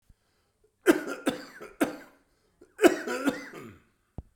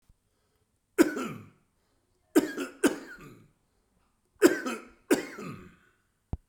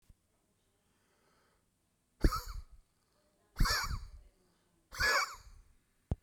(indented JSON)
{
  "cough_length": "4.4 s",
  "cough_amplitude": 19123,
  "cough_signal_mean_std_ratio": 0.32,
  "three_cough_length": "6.5 s",
  "three_cough_amplitude": 17395,
  "three_cough_signal_mean_std_ratio": 0.29,
  "exhalation_length": "6.2 s",
  "exhalation_amplitude": 6341,
  "exhalation_signal_mean_std_ratio": 0.33,
  "survey_phase": "beta (2021-08-13 to 2022-03-07)",
  "age": "45-64",
  "gender": "Male",
  "wearing_mask": "No",
  "symptom_none": true,
  "smoker_status": "Current smoker (e-cigarettes or vapes only)",
  "respiratory_condition_asthma": false,
  "respiratory_condition_other": true,
  "recruitment_source": "REACT",
  "submission_delay": "10 days",
  "covid_test_result": "Negative",
  "covid_test_method": "RT-qPCR"
}